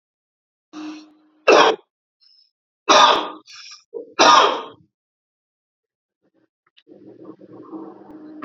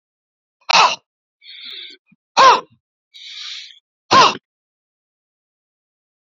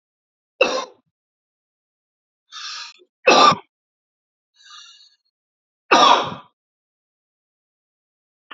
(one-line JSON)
{"three_cough_length": "8.4 s", "three_cough_amplitude": 31684, "three_cough_signal_mean_std_ratio": 0.31, "exhalation_length": "6.3 s", "exhalation_amplitude": 30441, "exhalation_signal_mean_std_ratio": 0.29, "cough_length": "8.5 s", "cough_amplitude": 29421, "cough_signal_mean_std_ratio": 0.26, "survey_phase": "alpha (2021-03-01 to 2021-08-12)", "age": "45-64", "gender": "Male", "wearing_mask": "No", "symptom_none": true, "smoker_status": "Never smoked", "respiratory_condition_asthma": false, "respiratory_condition_other": false, "recruitment_source": "REACT", "submission_delay": "1 day", "covid_test_result": "Negative", "covid_test_method": "RT-qPCR"}